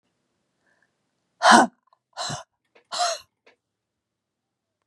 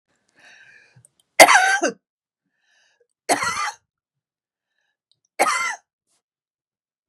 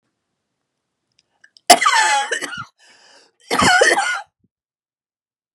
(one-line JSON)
{"exhalation_length": "4.9 s", "exhalation_amplitude": 30893, "exhalation_signal_mean_std_ratio": 0.23, "three_cough_length": "7.1 s", "three_cough_amplitude": 32768, "three_cough_signal_mean_std_ratio": 0.27, "cough_length": "5.5 s", "cough_amplitude": 32768, "cough_signal_mean_std_ratio": 0.38, "survey_phase": "beta (2021-08-13 to 2022-03-07)", "age": "45-64", "gender": "Female", "wearing_mask": "No", "symptom_none": true, "smoker_status": "Ex-smoker", "respiratory_condition_asthma": false, "respiratory_condition_other": true, "recruitment_source": "REACT", "submission_delay": "1 day", "covid_test_result": "Negative", "covid_test_method": "RT-qPCR", "influenza_a_test_result": "Negative", "influenza_b_test_result": "Negative"}